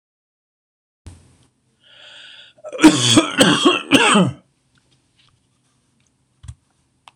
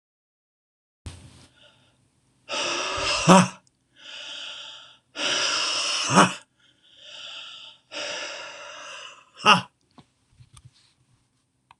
{"cough_length": "7.2 s", "cough_amplitude": 26028, "cough_signal_mean_std_ratio": 0.34, "exhalation_length": "11.8 s", "exhalation_amplitude": 26027, "exhalation_signal_mean_std_ratio": 0.35, "survey_phase": "beta (2021-08-13 to 2022-03-07)", "age": "65+", "gender": "Male", "wearing_mask": "No", "symptom_none": true, "smoker_status": "Never smoked", "respiratory_condition_asthma": false, "respiratory_condition_other": false, "recruitment_source": "REACT", "submission_delay": "1 day", "covid_test_result": "Negative", "covid_test_method": "RT-qPCR", "influenza_a_test_result": "Unknown/Void", "influenza_b_test_result": "Unknown/Void"}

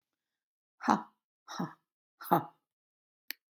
{"exhalation_length": "3.5 s", "exhalation_amplitude": 12266, "exhalation_signal_mean_std_ratio": 0.24, "survey_phase": "beta (2021-08-13 to 2022-03-07)", "age": "65+", "gender": "Female", "wearing_mask": "No", "symptom_none": true, "smoker_status": "Ex-smoker", "respiratory_condition_asthma": false, "respiratory_condition_other": false, "recruitment_source": "REACT", "submission_delay": "1 day", "covid_test_result": "Negative", "covid_test_method": "RT-qPCR", "influenza_a_test_result": "Negative", "influenza_b_test_result": "Negative"}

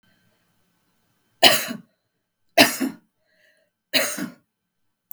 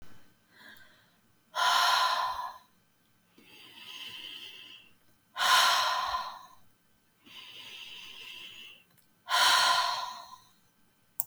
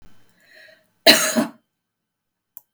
{"three_cough_length": "5.1 s", "three_cough_amplitude": 32768, "three_cough_signal_mean_std_ratio": 0.27, "exhalation_length": "11.3 s", "exhalation_amplitude": 15751, "exhalation_signal_mean_std_ratio": 0.46, "cough_length": "2.7 s", "cough_amplitude": 32768, "cough_signal_mean_std_ratio": 0.27, "survey_phase": "beta (2021-08-13 to 2022-03-07)", "age": "45-64", "gender": "Female", "wearing_mask": "No", "symptom_none": true, "smoker_status": "Ex-smoker", "respiratory_condition_asthma": false, "respiratory_condition_other": false, "recruitment_source": "REACT", "submission_delay": "2 days", "covid_test_result": "Negative", "covid_test_method": "RT-qPCR", "influenza_a_test_result": "Negative", "influenza_b_test_result": "Negative"}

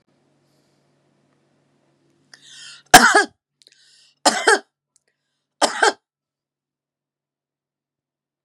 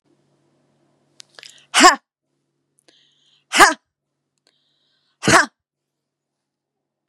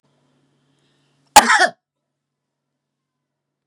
{"three_cough_length": "8.4 s", "three_cough_amplitude": 32768, "three_cough_signal_mean_std_ratio": 0.22, "exhalation_length": "7.1 s", "exhalation_amplitude": 32768, "exhalation_signal_mean_std_ratio": 0.21, "cough_length": "3.7 s", "cough_amplitude": 32768, "cough_signal_mean_std_ratio": 0.2, "survey_phase": "beta (2021-08-13 to 2022-03-07)", "age": "45-64", "gender": "Female", "wearing_mask": "No", "symptom_none": true, "smoker_status": "Never smoked", "respiratory_condition_asthma": false, "respiratory_condition_other": false, "recruitment_source": "REACT", "submission_delay": "1 day", "covid_test_result": "Negative", "covid_test_method": "RT-qPCR"}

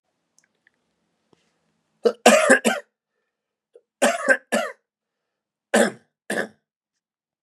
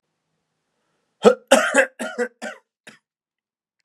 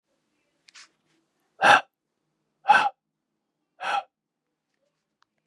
{"three_cough_length": "7.4 s", "three_cough_amplitude": 32047, "three_cough_signal_mean_std_ratio": 0.3, "cough_length": "3.8 s", "cough_amplitude": 32767, "cough_signal_mean_std_ratio": 0.28, "exhalation_length": "5.5 s", "exhalation_amplitude": 24421, "exhalation_signal_mean_std_ratio": 0.23, "survey_phase": "beta (2021-08-13 to 2022-03-07)", "age": "18-44", "gender": "Male", "wearing_mask": "No", "symptom_cough_any": true, "symptom_runny_or_blocked_nose": true, "symptom_sore_throat": true, "symptom_fatigue": true, "smoker_status": "Never smoked", "respiratory_condition_asthma": false, "respiratory_condition_other": false, "recruitment_source": "Test and Trace", "submission_delay": "-1 day", "covid_test_result": "Positive", "covid_test_method": "LFT"}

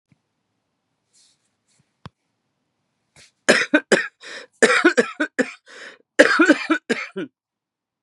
{"cough_length": "8.0 s", "cough_amplitude": 32768, "cough_signal_mean_std_ratio": 0.33, "survey_phase": "beta (2021-08-13 to 2022-03-07)", "age": "45-64", "gender": "Female", "wearing_mask": "No", "symptom_cough_any": true, "symptom_runny_or_blocked_nose": true, "symptom_shortness_of_breath": true, "symptom_sore_throat": true, "symptom_abdominal_pain": true, "symptom_diarrhoea": true, "symptom_fatigue": true, "symptom_fever_high_temperature": true, "symptom_headache": true, "symptom_change_to_sense_of_smell_or_taste": true, "symptom_loss_of_taste": true, "smoker_status": "Current smoker (1 to 10 cigarettes per day)", "respiratory_condition_asthma": false, "respiratory_condition_other": false, "recruitment_source": "Test and Trace", "submission_delay": "2 days", "covid_test_result": "Positive", "covid_test_method": "LFT"}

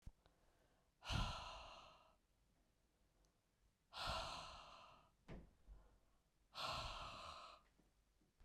{"exhalation_length": "8.4 s", "exhalation_amplitude": 946, "exhalation_signal_mean_std_ratio": 0.47, "survey_phase": "beta (2021-08-13 to 2022-03-07)", "age": "65+", "gender": "Female", "wearing_mask": "No", "symptom_none": true, "smoker_status": "Never smoked", "respiratory_condition_asthma": false, "respiratory_condition_other": false, "recruitment_source": "REACT", "submission_delay": "2 days", "covid_test_result": "Negative", "covid_test_method": "RT-qPCR", "influenza_a_test_result": "Unknown/Void", "influenza_b_test_result": "Unknown/Void"}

